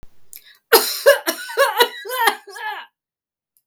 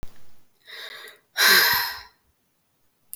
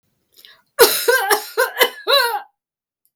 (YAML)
three_cough_length: 3.7 s
three_cough_amplitude: 32768
three_cough_signal_mean_std_ratio: 0.43
exhalation_length: 3.2 s
exhalation_amplitude: 26917
exhalation_signal_mean_std_ratio: 0.4
cough_length: 3.2 s
cough_amplitude: 32768
cough_signal_mean_std_ratio: 0.47
survey_phase: beta (2021-08-13 to 2022-03-07)
age: 45-64
gender: Female
wearing_mask: 'No'
symptom_fatigue: true
symptom_onset: 62 days
smoker_status: Never smoked
respiratory_condition_asthma: true
respiratory_condition_other: false
recruitment_source: Test and Trace
submission_delay: 59 days
covid_test_result: Negative
covid_test_method: RT-qPCR